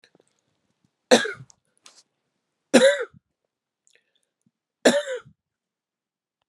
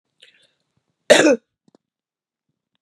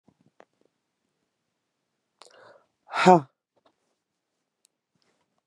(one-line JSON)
{"three_cough_length": "6.5 s", "three_cough_amplitude": 29873, "three_cough_signal_mean_std_ratio": 0.24, "cough_length": "2.8 s", "cough_amplitude": 32768, "cough_signal_mean_std_ratio": 0.24, "exhalation_length": "5.5 s", "exhalation_amplitude": 26720, "exhalation_signal_mean_std_ratio": 0.14, "survey_phase": "beta (2021-08-13 to 2022-03-07)", "age": "45-64", "gender": "Female", "wearing_mask": "No", "symptom_none": true, "symptom_onset": "4 days", "smoker_status": "Current smoker (11 or more cigarettes per day)", "respiratory_condition_asthma": false, "respiratory_condition_other": false, "recruitment_source": "Test and Trace", "submission_delay": "3 days", "covid_test_result": "Positive", "covid_test_method": "RT-qPCR", "covid_ct_value": 20.8, "covid_ct_gene": "ORF1ab gene"}